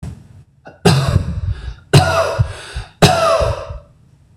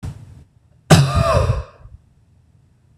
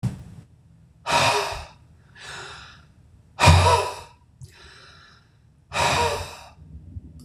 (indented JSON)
{
  "three_cough_length": "4.4 s",
  "three_cough_amplitude": 26028,
  "three_cough_signal_mean_std_ratio": 0.57,
  "cough_length": "3.0 s",
  "cough_amplitude": 26028,
  "cough_signal_mean_std_ratio": 0.41,
  "exhalation_length": "7.2 s",
  "exhalation_amplitude": 26028,
  "exhalation_signal_mean_std_ratio": 0.41,
  "survey_phase": "beta (2021-08-13 to 2022-03-07)",
  "age": "45-64",
  "gender": "Male",
  "wearing_mask": "No",
  "symptom_runny_or_blocked_nose": true,
  "smoker_status": "Never smoked",
  "respiratory_condition_asthma": true,
  "respiratory_condition_other": false,
  "recruitment_source": "Test and Trace",
  "submission_delay": "2 days",
  "covid_test_result": "Positive",
  "covid_test_method": "RT-qPCR",
  "covid_ct_value": 31.7,
  "covid_ct_gene": "N gene"
}